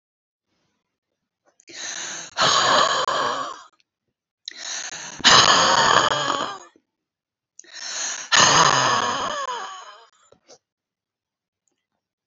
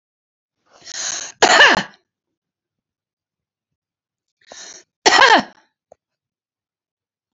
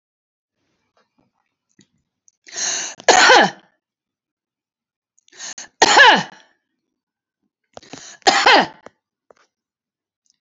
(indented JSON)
{
  "exhalation_length": "12.3 s",
  "exhalation_amplitude": 31782,
  "exhalation_signal_mean_std_ratio": 0.46,
  "cough_length": "7.3 s",
  "cough_amplitude": 31374,
  "cough_signal_mean_std_ratio": 0.27,
  "three_cough_length": "10.4 s",
  "three_cough_amplitude": 32247,
  "three_cough_signal_mean_std_ratio": 0.29,
  "survey_phase": "beta (2021-08-13 to 2022-03-07)",
  "age": "65+",
  "gender": "Female",
  "wearing_mask": "No",
  "symptom_none": true,
  "smoker_status": "Never smoked",
  "respiratory_condition_asthma": true,
  "respiratory_condition_other": false,
  "recruitment_source": "REACT",
  "submission_delay": "1 day",
  "covid_test_result": "Negative",
  "covid_test_method": "RT-qPCR",
  "influenza_a_test_result": "Negative",
  "influenza_b_test_result": "Negative"
}